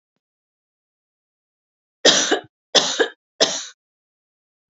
{"three_cough_length": "4.7 s", "three_cough_amplitude": 32224, "three_cough_signal_mean_std_ratio": 0.3, "survey_phase": "beta (2021-08-13 to 2022-03-07)", "age": "45-64", "gender": "Female", "wearing_mask": "No", "symptom_none": true, "smoker_status": "Never smoked", "respiratory_condition_asthma": false, "respiratory_condition_other": false, "recruitment_source": "REACT", "submission_delay": "1 day", "covid_test_result": "Negative", "covid_test_method": "RT-qPCR", "influenza_a_test_result": "Negative", "influenza_b_test_result": "Negative"}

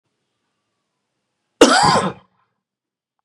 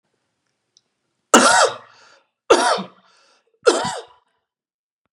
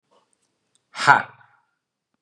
{"cough_length": "3.2 s", "cough_amplitude": 32768, "cough_signal_mean_std_ratio": 0.3, "three_cough_length": "5.1 s", "three_cough_amplitude": 32768, "three_cough_signal_mean_std_ratio": 0.33, "exhalation_length": "2.2 s", "exhalation_amplitude": 32747, "exhalation_signal_mean_std_ratio": 0.2, "survey_phase": "beta (2021-08-13 to 2022-03-07)", "age": "45-64", "gender": "Male", "wearing_mask": "No", "symptom_none": true, "smoker_status": "Never smoked", "respiratory_condition_asthma": false, "respiratory_condition_other": false, "recruitment_source": "REACT", "submission_delay": "1 day", "covid_test_result": "Negative", "covid_test_method": "RT-qPCR", "influenza_a_test_result": "Negative", "influenza_b_test_result": "Negative"}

